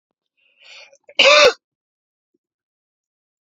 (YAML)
cough_length: 3.4 s
cough_amplitude: 32767
cough_signal_mean_std_ratio: 0.26
survey_phase: beta (2021-08-13 to 2022-03-07)
age: 18-44
gender: Male
wearing_mask: 'No'
symptom_cough_any: true
symptom_new_continuous_cough: true
symptom_runny_or_blocked_nose: true
symptom_fatigue: true
symptom_fever_high_temperature: true
symptom_onset: 10 days
smoker_status: Current smoker (e-cigarettes or vapes only)
respiratory_condition_asthma: false
respiratory_condition_other: false
recruitment_source: Test and Trace
submission_delay: 0 days
covid_test_result: Positive
covid_test_method: ePCR